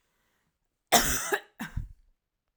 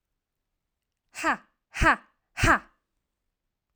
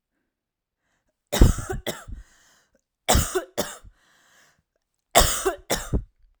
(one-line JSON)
{"cough_length": "2.6 s", "cough_amplitude": 17561, "cough_signal_mean_std_ratio": 0.34, "exhalation_length": "3.8 s", "exhalation_amplitude": 14715, "exhalation_signal_mean_std_ratio": 0.28, "three_cough_length": "6.4 s", "three_cough_amplitude": 32767, "three_cough_signal_mean_std_ratio": 0.33, "survey_phase": "alpha (2021-03-01 to 2021-08-12)", "age": "18-44", "gender": "Female", "wearing_mask": "No", "symptom_none": true, "smoker_status": "Never smoked", "respiratory_condition_asthma": false, "respiratory_condition_other": false, "recruitment_source": "REACT", "submission_delay": "1 day", "covid_test_result": "Negative", "covid_test_method": "RT-qPCR"}